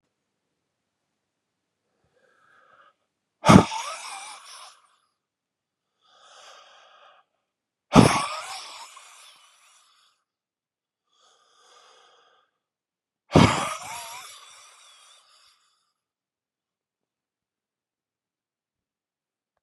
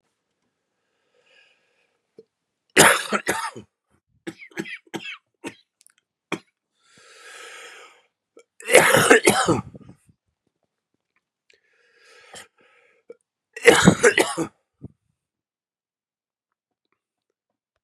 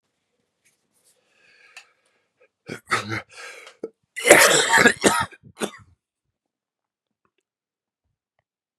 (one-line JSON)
{"exhalation_length": "19.6 s", "exhalation_amplitude": 32767, "exhalation_signal_mean_std_ratio": 0.18, "three_cough_length": "17.8 s", "three_cough_amplitude": 32768, "three_cough_signal_mean_std_ratio": 0.26, "cough_length": "8.8 s", "cough_amplitude": 32768, "cough_signal_mean_std_ratio": 0.27, "survey_phase": "beta (2021-08-13 to 2022-03-07)", "age": "45-64", "gender": "Male", "wearing_mask": "No", "symptom_cough_any": true, "symptom_new_continuous_cough": true, "symptom_runny_or_blocked_nose": true, "symptom_shortness_of_breath": true, "symptom_sore_throat": true, "symptom_fatigue": true, "symptom_fever_high_temperature": true, "symptom_headache": true, "symptom_other": true, "symptom_onset": "4 days", "smoker_status": "Never smoked", "respiratory_condition_asthma": false, "respiratory_condition_other": false, "recruitment_source": "Test and Trace", "submission_delay": "2 days", "covid_test_result": "Negative", "covid_test_method": "RT-qPCR"}